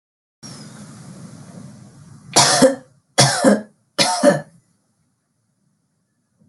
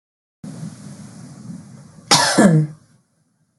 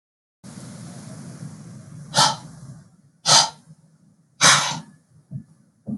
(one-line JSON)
{"three_cough_length": "6.5 s", "three_cough_amplitude": 32768, "three_cough_signal_mean_std_ratio": 0.36, "cough_length": "3.6 s", "cough_amplitude": 32768, "cough_signal_mean_std_ratio": 0.38, "exhalation_length": "6.0 s", "exhalation_amplitude": 32665, "exhalation_signal_mean_std_ratio": 0.35, "survey_phase": "beta (2021-08-13 to 2022-03-07)", "age": "18-44", "gender": "Female", "wearing_mask": "No", "symptom_none": true, "symptom_onset": "4 days", "smoker_status": "Never smoked", "respiratory_condition_asthma": false, "respiratory_condition_other": false, "recruitment_source": "REACT", "submission_delay": "3 days", "covid_test_result": "Negative", "covid_test_method": "RT-qPCR"}